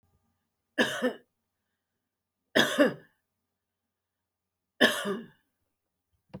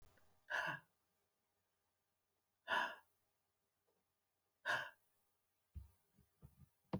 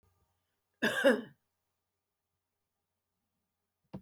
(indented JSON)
{
  "three_cough_length": "6.4 s",
  "three_cough_amplitude": 17087,
  "three_cough_signal_mean_std_ratio": 0.28,
  "exhalation_length": "7.0 s",
  "exhalation_amplitude": 1380,
  "exhalation_signal_mean_std_ratio": 0.29,
  "cough_length": "4.0 s",
  "cough_amplitude": 6611,
  "cough_signal_mean_std_ratio": 0.23,
  "survey_phase": "alpha (2021-03-01 to 2021-08-12)",
  "age": "45-64",
  "gender": "Female",
  "wearing_mask": "No",
  "symptom_none": true,
  "smoker_status": "Never smoked",
  "respiratory_condition_asthma": false,
  "respiratory_condition_other": false,
  "recruitment_source": "REACT",
  "submission_delay": "6 days",
  "covid_test_result": "Negative",
  "covid_test_method": "RT-qPCR"
}